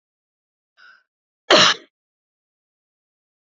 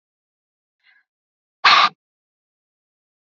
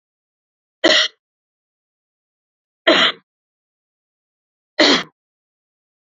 {
  "cough_length": "3.6 s",
  "cough_amplitude": 32767,
  "cough_signal_mean_std_ratio": 0.21,
  "exhalation_length": "3.2 s",
  "exhalation_amplitude": 29445,
  "exhalation_signal_mean_std_ratio": 0.22,
  "three_cough_length": "6.1 s",
  "three_cough_amplitude": 30454,
  "three_cough_signal_mean_std_ratio": 0.27,
  "survey_phase": "beta (2021-08-13 to 2022-03-07)",
  "age": "45-64",
  "gender": "Female",
  "wearing_mask": "No",
  "symptom_cough_any": true,
  "symptom_runny_or_blocked_nose": true,
  "symptom_fatigue": true,
  "symptom_change_to_sense_of_smell_or_taste": true,
  "symptom_onset": "7 days",
  "smoker_status": "Never smoked",
  "respiratory_condition_asthma": false,
  "respiratory_condition_other": false,
  "recruitment_source": "Test and Trace",
  "submission_delay": "3 days",
  "covid_test_result": "Positive",
  "covid_test_method": "RT-qPCR",
  "covid_ct_value": 20.7,
  "covid_ct_gene": "N gene"
}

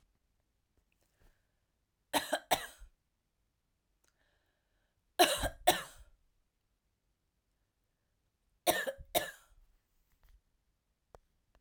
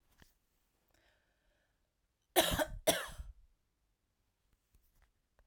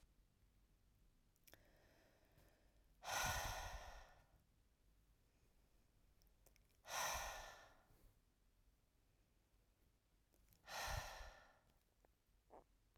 {
  "three_cough_length": "11.6 s",
  "three_cough_amplitude": 9889,
  "three_cough_signal_mean_std_ratio": 0.22,
  "cough_length": "5.5 s",
  "cough_amplitude": 6708,
  "cough_signal_mean_std_ratio": 0.24,
  "exhalation_length": "13.0 s",
  "exhalation_amplitude": 863,
  "exhalation_signal_mean_std_ratio": 0.39,
  "survey_phase": "beta (2021-08-13 to 2022-03-07)",
  "age": "18-44",
  "gender": "Female",
  "wearing_mask": "No",
  "symptom_none": true,
  "symptom_onset": "3 days",
  "smoker_status": "Never smoked",
  "respiratory_condition_asthma": false,
  "respiratory_condition_other": false,
  "recruitment_source": "REACT",
  "submission_delay": "2 days",
  "covid_test_result": "Negative",
  "covid_test_method": "RT-qPCR"
}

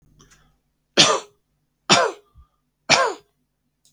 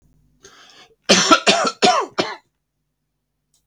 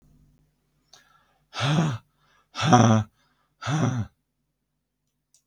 {
  "three_cough_length": "3.9 s",
  "three_cough_amplitude": 32768,
  "three_cough_signal_mean_std_ratio": 0.31,
  "cough_length": "3.7 s",
  "cough_amplitude": 32768,
  "cough_signal_mean_std_ratio": 0.38,
  "exhalation_length": "5.5 s",
  "exhalation_amplitude": 29890,
  "exhalation_signal_mean_std_ratio": 0.37,
  "survey_phase": "beta (2021-08-13 to 2022-03-07)",
  "age": "45-64",
  "gender": "Male",
  "wearing_mask": "No",
  "symptom_none": true,
  "smoker_status": "Never smoked",
  "respiratory_condition_asthma": false,
  "respiratory_condition_other": false,
  "recruitment_source": "Test and Trace",
  "submission_delay": "0 days",
  "covid_test_result": "Negative",
  "covid_test_method": "LFT"
}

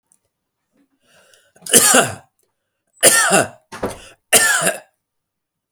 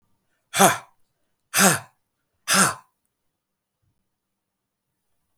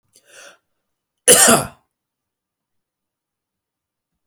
{
  "three_cough_length": "5.7 s",
  "three_cough_amplitude": 32768,
  "three_cough_signal_mean_std_ratio": 0.38,
  "exhalation_length": "5.4 s",
  "exhalation_amplitude": 32768,
  "exhalation_signal_mean_std_ratio": 0.27,
  "cough_length": "4.3 s",
  "cough_amplitude": 32768,
  "cough_signal_mean_std_ratio": 0.23,
  "survey_phase": "alpha (2021-03-01 to 2021-08-12)",
  "age": "45-64",
  "gender": "Male",
  "wearing_mask": "No",
  "symptom_none": true,
  "smoker_status": "Never smoked",
  "respiratory_condition_asthma": false,
  "respiratory_condition_other": false,
  "recruitment_source": "REACT",
  "submission_delay": "1 day",
  "covid_test_result": "Negative",
  "covid_test_method": "RT-qPCR"
}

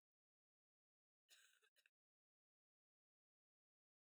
{
  "cough_length": "4.2 s",
  "cough_amplitude": 48,
  "cough_signal_mean_std_ratio": 0.22,
  "survey_phase": "beta (2021-08-13 to 2022-03-07)",
  "age": "18-44",
  "gender": "Female",
  "wearing_mask": "No",
  "symptom_none": true,
  "smoker_status": "Current smoker (11 or more cigarettes per day)",
  "respiratory_condition_asthma": false,
  "respiratory_condition_other": false,
  "recruitment_source": "REACT",
  "submission_delay": "1 day",
  "covid_test_result": "Negative",
  "covid_test_method": "RT-qPCR",
  "influenza_a_test_result": "Negative",
  "influenza_b_test_result": "Negative"
}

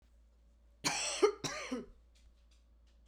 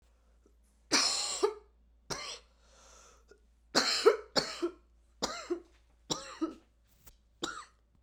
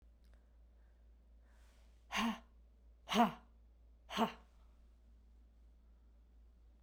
{
  "cough_length": "3.1 s",
  "cough_amplitude": 4957,
  "cough_signal_mean_std_ratio": 0.39,
  "three_cough_length": "8.0 s",
  "three_cough_amplitude": 10191,
  "three_cough_signal_mean_std_ratio": 0.38,
  "exhalation_length": "6.8 s",
  "exhalation_amplitude": 3446,
  "exhalation_signal_mean_std_ratio": 0.31,
  "survey_phase": "beta (2021-08-13 to 2022-03-07)",
  "age": "45-64",
  "gender": "Female",
  "wearing_mask": "No",
  "symptom_new_continuous_cough": true,
  "symptom_runny_or_blocked_nose": true,
  "symptom_shortness_of_breath": true,
  "symptom_fatigue": true,
  "symptom_onset": "3 days",
  "smoker_status": "Never smoked",
  "respiratory_condition_asthma": true,
  "respiratory_condition_other": false,
  "recruitment_source": "Test and Trace",
  "submission_delay": "1 day",
  "covid_test_result": "Positive",
  "covid_test_method": "RT-qPCR",
  "covid_ct_value": 25.4,
  "covid_ct_gene": "ORF1ab gene"
}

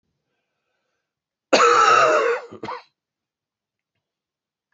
{
  "cough_length": "4.7 s",
  "cough_amplitude": 26707,
  "cough_signal_mean_std_ratio": 0.37,
  "survey_phase": "beta (2021-08-13 to 2022-03-07)",
  "age": "65+",
  "gender": "Male",
  "wearing_mask": "No",
  "symptom_cough_any": true,
  "symptom_shortness_of_breath": true,
  "symptom_fatigue": true,
  "symptom_onset": "13 days",
  "smoker_status": "Ex-smoker",
  "respiratory_condition_asthma": false,
  "respiratory_condition_other": false,
  "recruitment_source": "REACT",
  "submission_delay": "1 day",
  "covid_test_result": "Negative",
  "covid_test_method": "RT-qPCR"
}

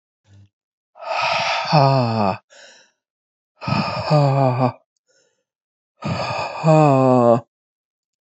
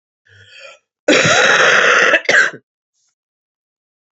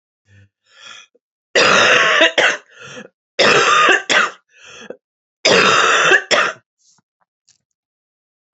{
  "exhalation_length": "8.3 s",
  "exhalation_amplitude": 26610,
  "exhalation_signal_mean_std_ratio": 0.52,
  "cough_length": "4.2 s",
  "cough_amplitude": 30582,
  "cough_signal_mean_std_ratio": 0.5,
  "three_cough_length": "8.5 s",
  "three_cough_amplitude": 32767,
  "three_cough_signal_mean_std_ratio": 0.5,
  "survey_phase": "beta (2021-08-13 to 2022-03-07)",
  "age": "45-64",
  "gender": "Female",
  "wearing_mask": "No",
  "symptom_cough_any": true,
  "symptom_runny_or_blocked_nose": true,
  "symptom_sore_throat": true,
  "symptom_headache": true,
  "symptom_onset": "8 days",
  "smoker_status": "Ex-smoker",
  "respiratory_condition_asthma": false,
  "respiratory_condition_other": false,
  "recruitment_source": "Test and Trace",
  "submission_delay": "2 days",
  "covid_test_result": "Positive",
  "covid_test_method": "RT-qPCR",
  "covid_ct_value": 23.4,
  "covid_ct_gene": "ORF1ab gene",
  "covid_ct_mean": 23.7,
  "covid_viral_load": "17000 copies/ml",
  "covid_viral_load_category": "Low viral load (10K-1M copies/ml)"
}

